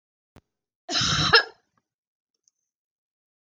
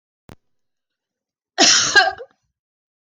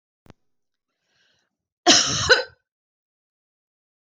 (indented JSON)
{
  "cough_length": "3.4 s",
  "cough_amplitude": 22021,
  "cough_signal_mean_std_ratio": 0.29,
  "exhalation_length": "3.2 s",
  "exhalation_amplitude": 25301,
  "exhalation_signal_mean_std_ratio": 0.32,
  "three_cough_length": "4.1 s",
  "three_cough_amplitude": 22325,
  "three_cough_signal_mean_std_ratio": 0.26,
  "survey_phase": "beta (2021-08-13 to 2022-03-07)",
  "age": "65+",
  "gender": "Female",
  "wearing_mask": "No",
  "symptom_none": true,
  "smoker_status": "Never smoked",
  "respiratory_condition_asthma": false,
  "respiratory_condition_other": false,
  "recruitment_source": "REACT",
  "submission_delay": "2 days",
  "covid_test_result": "Negative",
  "covid_test_method": "RT-qPCR"
}